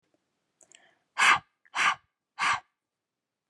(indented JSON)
{
  "exhalation_length": "3.5 s",
  "exhalation_amplitude": 13727,
  "exhalation_signal_mean_std_ratio": 0.32,
  "survey_phase": "beta (2021-08-13 to 2022-03-07)",
  "age": "18-44",
  "gender": "Female",
  "wearing_mask": "No",
  "symptom_cough_any": true,
  "symptom_runny_or_blocked_nose": true,
  "symptom_fatigue": true,
  "symptom_headache": true,
  "symptom_onset": "4 days",
  "smoker_status": "Ex-smoker",
  "respiratory_condition_asthma": false,
  "respiratory_condition_other": false,
  "recruitment_source": "Test and Trace",
  "submission_delay": "2 days",
  "covid_test_result": "Negative",
  "covid_test_method": "ePCR"
}